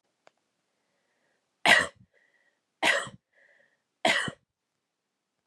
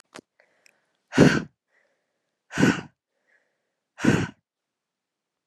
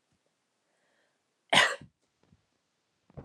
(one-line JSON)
{"three_cough_length": "5.5 s", "three_cough_amplitude": 16391, "three_cough_signal_mean_std_ratio": 0.26, "exhalation_length": "5.5 s", "exhalation_amplitude": 28438, "exhalation_signal_mean_std_ratio": 0.27, "cough_length": "3.2 s", "cough_amplitude": 16456, "cough_signal_mean_std_ratio": 0.2, "survey_phase": "alpha (2021-03-01 to 2021-08-12)", "age": "18-44", "gender": "Female", "wearing_mask": "No", "symptom_headache": true, "smoker_status": "Never smoked", "respiratory_condition_asthma": false, "respiratory_condition_other": false, "recruitment_source": "Test and Trace", "submission_delay": "2 days", "covid_test_result": "Positive", "covid_test_method": "RT-qPCR", "covid_ct_value": 16.4, "covid_ct_gene": "ORF1ab gene", "covid_ct_mean": 17.5, "covid_viral_load": "1800000 copies/ml", "covid_viral_load_category": "High viral load (>1M copies/ml)"}